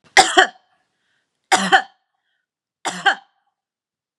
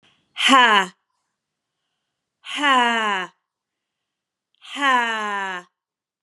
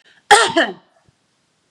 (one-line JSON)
{"three_cough_length": "4.2 s", "three_cough_amplitude": 32767, "three_cough_signal_mean_std_ratio": 0.29, "exhalation_length": "6.2 s", "exhalation_amplitude": 30280, "exhalation_signal_mean_std_ratio": 0.41, "cough_length": "1.7 s", "cough_amplitude": 32768, "cough_signal_mean_std_ratio": 0.34, "survey_phase": "beta (2021-08-13 to 2022-03-07)", "age": "45-64", "gender": "Female", "wearing_mask": "No", "symptom_loss_of_taste": true, "symptom_onset": "5 days", "smoker_status": "Never smoked", "respiratory_condition_asthma": false, "respiratory_condition_other": false, "recruitment_source": "REACT", "submission_delay": "1 day", "covid_test_result": "Negative", "covid_test_method": "RT-qPCR", "influenza_a_test_result": "Negative", "influenza_b_test_result": "Negative"}